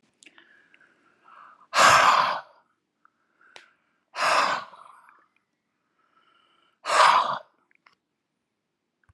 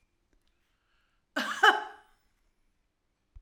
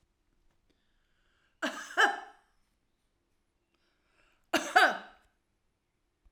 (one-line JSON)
{"exhalation_length": "9.1 s", "exhalation_amplitude": 22080, "exhalation_signal_mean_std_ratio": 0.33, "cough_length": "3.4 s", "cough_amplitude": 13602, "cough_signal_mean_std_ratio": 0.23, "three_cough_length": "6.3 s", "three_cough_amplitude": 15044, "three_cough_signal_mean_std_ratio": 0.24, "survey_phase": "alpha (2021-03-01 to 2021-08-12)", "age": "65+", "gender": "Female", "wearing_mask": "No", "symptom_none": true, "smoker_status": "Ex-smoker", "respiratory_condition_asthma": false, "respiratory_condition_other": false, "recruitment_source": "REACT", "submission_delay": "1 day", "covid_test_result": "Negative", "covid_test_method": "RT-qPCR"}